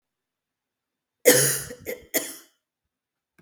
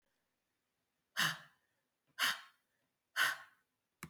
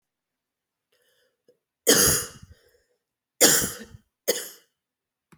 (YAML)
cough_length: 3.4 s
cough_amplitude: 30432
cough_signal_mean_std_ratio: 0.29
exhalation_length: 4.1 s
exhalation_amplitude: 3498
exhalation_signal_mean_std_ratio: 0.3
three_cough_length: 5.4 s
three_cough_amplitude: 26470
three_cough_signal_mean_std_ratio: 0.3
survey_phase: beta (2021-08-13 to 2022-03-07)
age: 45-64
gender: Female
wearing_mask: 'No'
symptom_cough_any: true
symptom_runny_or_blocked_nose: true
symptom_change_to_sense_of_smell_or_taste: true
symptom_loss_of_taste: true
symptom_onset: 3 days
smoker_status: Never smoked
respiratory_condition_asthma: false
respiratory_condition_other: false
recruitment_source: Test and Trace
submission_delay: 2 days
covid_test_result: Positive
covid_test_method: RT-qPCR
covid_ct_value: 22.4
covid_ct_gene: ORF1ab gene
covid_ct_mean: 23.2
covid_viral_load: 24000 copies/ml
covid_viral_load_category: Low viral load (10K-1M copies/ml)